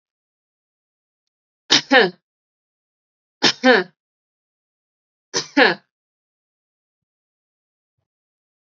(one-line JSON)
{"three_cough_length": "8.7 s", "three_cough_amplitude": 31284, "three_cough_signal_mean_std_ratio": 0.23, "survey_phase": "beta (2021-08-13 to 2022-03-07)", "age": "18-44", "gender": "Female", "wearing_mask": "No", "symptom_abdominal_pain": true, "smoker_status": "Never smoked", "respiratory_condition_asthma": false, "respiratory_condition_other": false, "recruitment_source": "REACT", "submission_delay": "5 days", "covid_test_result": "Negative", "covid_test_method": "RT-qPCR", "influenza_a_test_result": "Negative", "influenza_b_test_result": "Negative"}